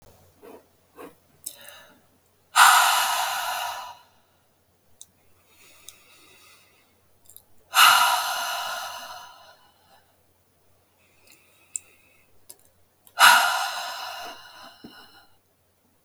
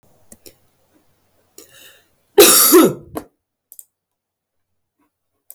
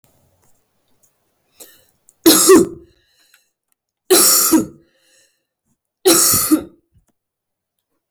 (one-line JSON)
{"exhalation_length": "16.0 s", "exhalation_amplitude": 32000, "exhalation_signal_mean_std_ratio": 0.32, "cough_length": "5.5 s", "cough_amplitude": 32768, "cough_signal_mean_std_ratio": 0.27, "three_cough_length": "8.1 s", "three_cough_amplitude": 32768, "three_cough_signal_mean_std_ratio": 0.36, "survey_phase": "beta (2021-08-13 to 2022-03-07)", "age": "18-44", "gender": "Female", "wearing_mask": "No", "symptom_cough_any": true, "symptom_new_continuous_cough": true, "symptom_runny_or_blocked_nose": true, "symptom_sore_throat": true, "symptom_headache": true, "symptom_change_to_sense_of_smell_or_taste": true, "smoker_status": "Never smoked", "respiratory_condition_asthma": false, "respiratory_condition_other": false, "recruitment_source": "Test and Trace", "submission_delay": "2 days", "covid_test_result": "Positive", "covid_test_method": "LFT"}